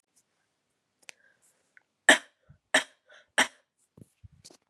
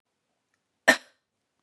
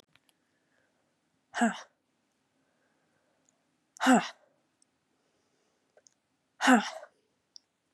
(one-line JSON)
{"three_cough_length": "4.7 s", "three_cough_amplitude": 19464, "three_cough_signal_mean_std_ratio": 0.17, "cough_length": "1.6 s", "cough_amplitude": 21188, "cough_signal_mean_std_ratio": 0.16, "exhalation_length": "7.9 s", "exhalation_amplitude": 11694, "exhalation_signal_mean_std_ratio": 0.22, "survey_phase": "beta (2021-08-13 to 2022-03-07)", "age": "18-44", "gender": "Female", "wearing_mask": "No", "symptom_cough_any": true, "symptom_runny_or_blocked_nose": true, "symptom_shortness_of_breath": true, "symptom_sore_throat": true, "symptom_fatigue": true, "symptom_headache": true, "symptom_onset": "2 days", "smoker_status": "Never smoked", "respiratory_condition_asthma": false, "respiratory_condition_other": false, "recruitment_source": "Test and Trace", "submission_delay": "2 days", "covid_test_result": "Positive", "covid_test_method": "RT-qPCR", "covid_ct_value": 25.4, "covid_ct_gene": "ORF1ab gene"}